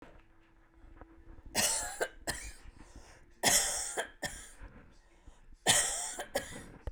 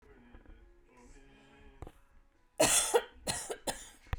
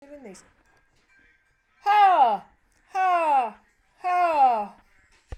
{"three_cough_length": "6.9 s", "three_cough_amplitude": 9167, "three_cough_signal_mean_std_ratio": 0.47, "cough_length": "4.2 s", "cough_amplitude": 7334, "cough_signal_mean_std_ratio": 0.36, "exhalation_length": "5.4 s", "exhalation_amplitude": 13847, "exhalation_signal_mean_std_ratio": 0.52, "survey_phase": "beta (2021-08-13 to 2022-03-07)", "age": "45-64", "gender": "Female", "wearing_mask": "No", "symptom_cough_any": true, "symptom_shortness_of_breath": true, "symptom_loss_of_taste": true, "symptom_onset": "12 days", "smoker_status": "Never smoked", "respiratory_condition_asthma": false, "respiratory_condition_other": false, "recruitment_source": "REACT", "submission_delay": "3 days", "covid_test_result": "Negative", "covid_test_method": "RT-qPCR", "influenza_a_test_result": "Negative", "influenza_b_test_result": "Negative"}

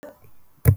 {"cough_length": "0.8 s", "cough_amplitude": 24363, "cough_signal_mean_std_ratio": 0.32, "survey_phase": "beta (2021-08-13 to 2022-03-07)", "age": "45-64", "gender": "Female", "wearing_mask": "No", "symptom_none": true, "smoker_status": "Ex-smoker", "respiratory_condition_asthma": false, "respiratory_condition_other": false, "recruitment_source": "REACT", "submission_delay": "4 days", "covid_test_result": "Negative", "covid_test_method": "RT-qPCR"}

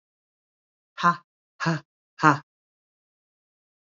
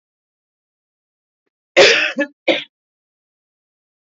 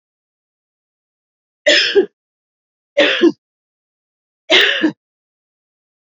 {"exhalation_length": "3.8 s", "exhalation_amplitude": 26088, "exhalation_signal_mean_std_ratio": 0.23, "cough_length": "4.0 s", "cough_amplitude": 29973, "cough_signal_mean_std_ratio": 0.28, "three_cough_length": "6.1 s", "three_cough_amplitude": 30627, "three_cough_signal_mean_std_ratio": 0.33, "survey_phase": "alpha (2021-03-01 to 2021-08-12)", "age": "45-64", "gender": "Female", "wearing_mask": "No", "symptom_none": true, "smoker_status": "Never smoked", "respiratory_condition_asthma": false, "respiratory_condition_other": false, "recruitment_source": "REACT", "submission_delay": "1 day", "covid_test_result": "Negative", "covid_test_method": "RT-qPCR"}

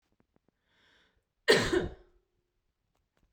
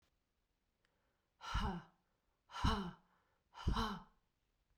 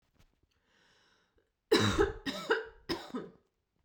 {"cough_length": "3.3 s", "cough_amplitude": 11258, "cough_signal_mean_std_ratio": 0.26, "exhalation_length": "4.8 s", "exhalation_amplitude": 2742, "exhalation_signal_mean_std_ratio": 0.38, "three_cough_length": "3.8 s", "three_cough_amplitude": 7118, "three_cough_signal_mean_std_ratio": 0.37, "survey_phase": "beta (2021-08-13 to 2022-03-07)", "age": "18-44", "gender": "Female", "wearing_mask": "No", "symptom_cough_any": true, "symptom_runny_or_blocked_nose": true, "symptom_sore_throat": true, "symptom_fatigue": true, "symptom_headache": true, "symptom_onset": "3 days", "smoker_status": "Never smoked", "respiratory_condition_asthma": false, "respiratory_condition_other": false, "recruitment_source": "Test and Trace", "submission_delay": "2 days", "covid_test_result": "Positive", "covid_test_method": "RT-qPCR"}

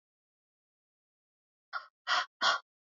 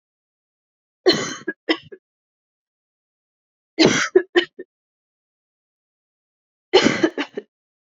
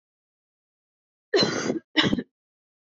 {"exhalation_length": "3.0 s", "exhalation_amplitude": 5927, "exhalation_signal_mean_std_ratio": 0.28, "three_cough_length": "7.9 s", "three_cough_amplitude": 32768, "three_cough_signal_mean_std_ratio": 0.28, "cough_length": "2.9 s", "cough_amplitude": 17600, "cough_signal_mean_std_ratio": 0.37, "survey_phase": "beta (2021-08-13 to 2022-03-07)", "age": "18-44", "gender": "Female", "wearing_mask": "No", "symptom_cough_any": true, "symptom_runny_or_blocked_nose": true, "symptom_fatigue": true, "symptom_onset": "3 days", "smoker_status": "Never smoked", "respiratory_condition_asthma": false, "respiratory_condition_other": false, "recruitment_source": "Test and Trace", "submission_delay": "2 days", "covid_test_result": "Positive", "covid_test_method": "RT-qPCR", "covid_ct_value": 24.9, "covid_ct_gene": "N gene"}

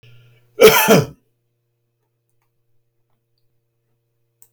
{"cough_length": "4.5 s", "cough_amplitude": 32768, "cough_signal_mean_std_ratio": 0.25, "survey_phase": "beta (2021-08-13 to 2022-03-07)", "age": "65+", "gender": "Male", "wearing_mask": "No", "symptom_none": true, "smoker_status": "Ex-smoker", "respiratory_condition_asthma": false, "respiratory_condition_other": false, "recruitment_source": "REACT", "submission_delay": "4 days", "covid_test_result": "Negative", "covid_test_method": "RT-qPCR"}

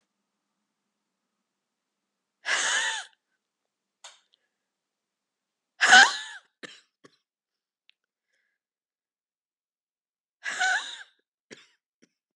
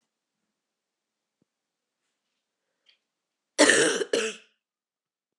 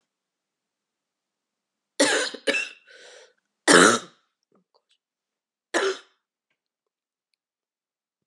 {"exhalation_length": "12.4 s", "exhalation_amplitude": 28139, "exhalation_signal_mean_std_ratio": 0.21, "cough_length": "5.4 s", "cough_amplitude": 21752, "cough_signal_mean_std_ratio": 0.25, "three_cough_length": "8.3 s", "three_cough_amplitude": 27328, "three_cough_signal_mean_std_ratio": 0.25, "survey_phase": "beta (2021-08-13 to 2022-03-07)", "age": "45-64", "gender": "Female", "wearing_mask": "No", "symptom_cough_any": true, "symptom_runny_or_blocked_nose": true, "symptom_shortness_of_breath": true, "symptom_sore_throat": true, "symptom_fatigue": true, "symptom_fever_high_temperature": true, "symptom_headache": true, "symptom_onset": "2 days", "smoker_status": "Ex-smoker", "respiratory_condition_asthma": true, "respiratory_condition_other": false, "recruitment_source": "Test and Trace", "submission_delay": "1 day", "covid_test_result": "Positive", "covid_test_method": "RT-qPCR", "covid_ct_value": 22.9, "covid_ct_gene": "ORF1ab gene"}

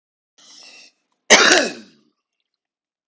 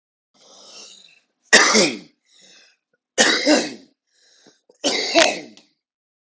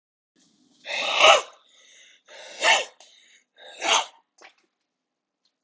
{"cough_length": "3.1 s", "cough_amplitude": 32768, "cough_signal_mean_std_ratio": 0.28, "three_cough_length": "6.4 s", "three_cough_amplitude": 32768, "three_cough_signal_mean_std_ratio": 0.36, "exhalation_length": "5.6 s", "exhalation_amplitude": 29438, "exhalation_signal_mean_std_ratio": 0.31, "survey_phase": "beta (2021-08-13 to 2022-03-07)", "age": "18-44", "gender": "Male", "wearing_mask": "No", "symptom_runny_or_blocked_nose": true, "symptom_change_to_sense_of_smell_or_taste": true, "smoker_status": "Current smoker (11 or more cigarettes per day)", "respiratory_condition_asthma": false, "respiratory_condition_other": false, "recruitment_source": "Test and Trace", "submission_delay": "2 days", "covid_test_result": "Positive", "covid_test_method": "RT-qPCR"}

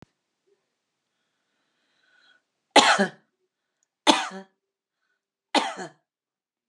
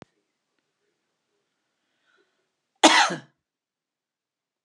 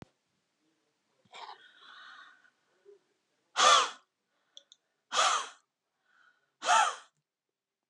{"three_cough_length": "6.7 s", "three_cough_amplitude": 29607, "three_cough_signal_mean_std_ratio": 0.23, "cough_length": "4.6 s", "cough_amplitude": 28696, "cough_signal_mean_std_ratio": 0.19, "exhalation_length": "7.9 s", "exhalation_amplitude": 11228, "exhalation_signal_mean_std_ratio": 0.28, "survey_phase": "alpha (2021-03-01 to 2021-08-12)", "age": "65+", "gender": "Female", "wearing_mask": "No", "symptom_none": true, "smoker_status": "Never smoked", "respiratory_condition_asthma": false, "respiratory_condition_other": false, "recruitment_source": "REACT", "submission_delay": "2 days", "covid_test_result": "Negative", "covid_test_method": "RT-qPCR"}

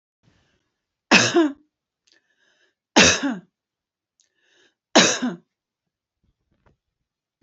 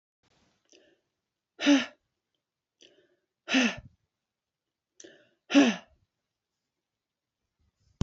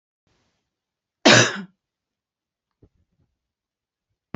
{"three_cough_length": "7.4 s", "three_cough_amplitude": 29973, "three_cough_signal_mean_std_ratio": 0.28, "exhalation_length": "8.0 s", "exhalation_amplitude": 12693, "exhalation_signal_mean_std_ratio": 0.23, "cough_length": "4.4 s", "cough_amplitude": 31503, "cough_signal_mean_std_ratio": 0.19, "survey_phase": "beta (2021-08-13 to 2022-03-07)", "age": "45-64", "gender": "Female", "wearing_mask": "No", "symptom_headache": true, "smoker_status": "Never smoked", "respiratory_condition_asthma": false, "respiratory_condition_other": false, "recruitment_source": "REACT", "submission_delay": "1 day", "covid_test_result": "Negative", "covid_test_method": "RT-qPCR"}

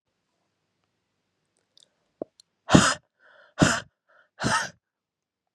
{"exhalation_length": "5.5 s", "exhalation_amplitude": 29496, "exhalation_signal_mean_std_ratio": 0.24, "survey_phase": "beta (2021-08-13 to 2022-03-07)", "age": "18-44", "gender": "Female", "wearing_mask": "No", "symptom_cough_any": true, "symptom_new_continuous_cough": true, "symptom_runny_or_blocked_nose": true, "symptom_abdominal_pain": true, "symptom_fatigue": true, "symptom_fever_high_temperature": true, "symptom_headache": true, "symptom_change_to_sense_of_smell_or_taste": true, "symptom_loss_of_taste": true, "symptom_onset": "4 days", "smoker_status": "Current smoker (e-cigarettes or vapes only)", "respiratory_condition_asthma": false, "respiratory_condition_other": false, "recruitment_source": "Test and Trace", "submission_delay": "1 day", "covid_test_result": "Positive", "covid_test_method": "RT-qPCR", "covid_ct_value": 16.7, "covid_ct_gene": "S gene", "covid_ct_mean": 17.1, "covid_viral_load": "2400000 copies/ml", "covid_viral_load_category": "High viral load (>1M copies/ml)"}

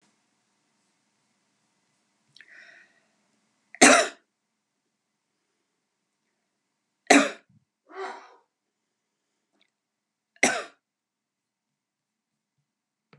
{"three_cough_length": "13.2 s", "three_cough_amplitude": 31148, "three_cough_signal_mean_std_ratio": 0.16, "survey_phase": "beta (2021-08-13 to 2022-03-07)", "age": "65+", "gender": "Female", "wearing_mask": "No", "symptom_none": true, "smoker_status": "Never smoked", "respiratory_condition_asthma": false, "respiratory_condition_other": false, "recruitment_source": "REACT", "submission_delay": "2 days", "covid_test_result": "Negative", "covid_test_method": "RT-qPCR"}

